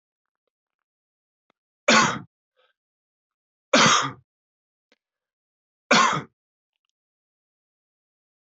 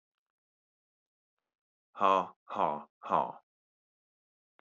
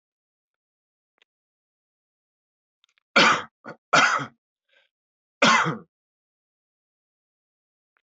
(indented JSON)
{
  "three_cough_length": "8.4 s",
  "three_cough_amplitude": 20709,
  "three_cough_signal_mean_std_ratio": 0.26,
  "exhalation_length": "4.6 s",
  "exhalation_amplitude": 9090,
  "exhalation_signal_mean_std_ratio": 0.27,
  "cough_length": "8.0 s",
  "cough_amplitude": 19683,
  "cough_signal_mean_std_ratio": 0.26,
  "survey_phase": "beta (2021-08-13 to 2022-03-07)",
  "age": "18-44",
  "gender": "Male",
  "wearing_mask": "No",
  "symptom_cough_any": true,
  "symptom_runny_or_blocked_nose": true,
  "symptom_sore_throat": true,
  "smoker_status": "Ex-smoker",
  "respiratory_condition_asthma": false,
  "respiratory_condition_other": false,
  "recruitment_source": "Test and Trace",
  "submission_delay": "2 days",
  "covid_test_result": "Positive",
  "covid_test_method": "RT-qPCR",
  "covid_ct_value": 23.7,
  "covid_ct_gene": "ORF1ab gene",
  "covid_ct_mean": 24.1,
  "covid_viral_load": "12000 copies/ml",
  "covid_viral_load_category": "Low viral load (10K-1M copies/ml)"
}